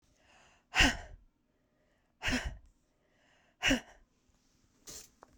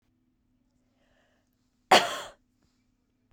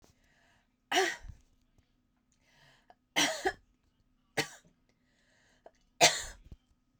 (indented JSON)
{
  "exhalation_length": "5.4 s",
  "exhalation_amplitude": 7999,
  "exhalation_signal_mean_std_ratio": 0.28,
  "cough_length": "3.3 s",
  "cough_amplitude": 20872,
  "cough_signal_mean_std_ratio": 0.18,
  "three_cough_length": "7.0 s",
  "three_cough_amplitude": 13928,
  "three_cough_signal_mean_std_ratio": 0.26,
  "survey_phase": "beta (2021-08-13 to 2022-03-07)",
  "age": "45-64",
  "gender": "Female",
  "wearing_mask": "No",
  "symptom_cough_any": true,
  "symptom_runny_or_blocked_nose": true,
  "symptom_fatigue": true,
  "symptom_headache": true,
  "symptom_other": true,
  "symptom_onset": "3 days",
  "smoker_status": "Never smoked",
  "respiratory_condition_asthma": false,
  "respiratory_condition_other": false,
  "recruitment_source": "Test and Trace",
  "submission_delay": "2 days",
  "covid_test_result": "Positive",
  "covid_test_method": "RT-qPCR",
  "covid_ct_value": 30.6,
  "covid_ct_gene": "ORF1ab gene",
  "covid_ct_mean": 31.9,
  "covid_viral_load": "34 copies/ml",
  "covid_viral_load_category": "Minimal viral load (< 10K copies/ml)"
}